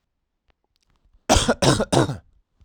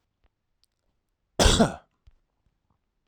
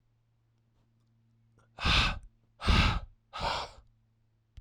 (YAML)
three_cough_length: 2.6 s
three_cough_amplitude: 31155
three_cough_signal_mean_std_ratio: 0.38
cough_length: 3.1 s
cough_amplitude: 17058
cough_signal_mean_std_ratio: 0.25
exhalation_length: 4.6 s
exhalation_amplitude: 7189
exhalation_signal_mean_std_ratio: 0.38
survey_phase: alpha (2021-03-01 to 2021-08-12)
age: 18-44
gender: Male
wearing_mask: 'No'
symptom_abdominal_pain: true
symptom_headache: true
smoker_status: Never smoked
respiratory_condition_asthma: false
respiratory_condition_other: false
recruitment_source: Test and Trace
submission_delay: 1 day
covid_test_result: Positive
covid_test_method: RT-qPCR
covid_ct_value: 15.8
covid_ct_gene: ORF1ab gene
covid_ct_mean: 16.3
covid_viral_load: 4600000 copies/ml
covid_viral_load_category: High viral load (>1M copies/ml)